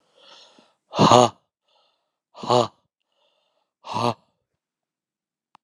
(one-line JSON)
{"exhalation_length": "5.6 s", "exhalation_amplitude": 32766, "exhalation_signal_mean_std_ratio": 0.25, "survey_phase": "alpha (2021-03-01 to 2021-08-12)", "age": "45-64", "gender": "Male", "wearing_mask": "No", "symptom_shortness_of_breath": true, "symptom_fever_high_temperature": true, "symptom_onset": "3 days", "smoker_status": "Never smoked", "respiratory_condition_asthma": true, "respiratory_condition_other": true, "recruitment_source": "Test and Trace", "submission_delay": "2 days", "covid_test_result": "Positive", "covid_test_method": "RT-qPCR"}